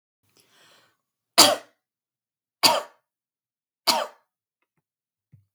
{"three_cough_length": "5.5 s", "three_cough_amplitude": 32768, "three_cough_signal_mean_std_ratio": 0.22, "survey_phase": "beta (2021-08-13 to 2022-03-07)", "age": "18-44", "gender": "Female", "wearing_mask": "No", "symptom_none": true, "smoker_status": "Ex-smoker", "respiratory_condition_asthma": false, "respiratory_condition_other": false, "recruitment_source": "REACT", "submission_delay": "1 day", "covid_test_result": "Negative", "covid_test_method": "RT-qPCR", "influenza_a_test_result": "Negative", "influenza_b_test_result": "Negative"}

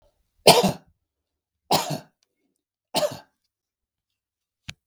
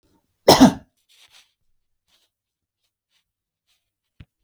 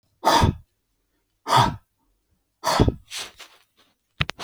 {"three_cough_length": "4.9 s", "three_cough_amplitude": 32768, "three_cough_signal_mean_std_ratio": 0.25, "cough_length": "4.4 s", "cough_amplitude": 32768, "cough_signal_mean_std_ratio": 0.18, "exhalation_length": "4.4 s", "exhalation_amplitude": 30526, "exhalation_signal_mean_std_ratio": 0.36, "survey_phase": "beta (2021-08-13 to 2022-03-07)", "age": "65+", "gender": "Male", "wearing_mask": "No", "symptom_none": true, "smoker_status": "Never smoked", "respiratory_condition_asthma": false, "respiratory_condition_other": false, "recruitment_source": "REACT", "submission_delay": "2 days", "covid_test_result": "Negative", "covid_test_method": "RT-qPCR", "influenza_a_test_result": "Negative", "influenza_b_test_result": "Negative"}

